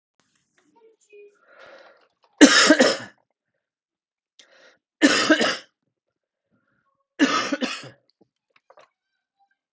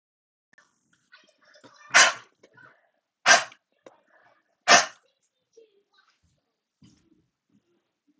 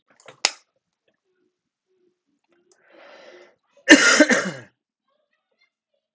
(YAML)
three_cough_length: 9.7 s
three_cough_amplitude: 32768
three_cough_signal_mean_std_ratio: 0.28
exhalation_length: 8.2 s
exhalation_amplitude: 26761
exhalation_signal_mean_std_ratio: 0.2
cough_length: 6.1 s
cough_amplitude: 32768
cough_signal_mean_std_ratio: 0.23
survey_phase: alpha (2021-03-01 to 2021-08-12)
age: 45-64
gender: Male
wearing_mask: 'No'
symptom_new_continuous_cough: true
symptom_fatigue: true
smoker_status: Ex-smoker
respiratory_condition_asthma: false
respiratory_condition_other: false
recruitment_source: Test and Trace
submission_delay: 2 days
covid_test_result: Positive
covid_test_method: LFT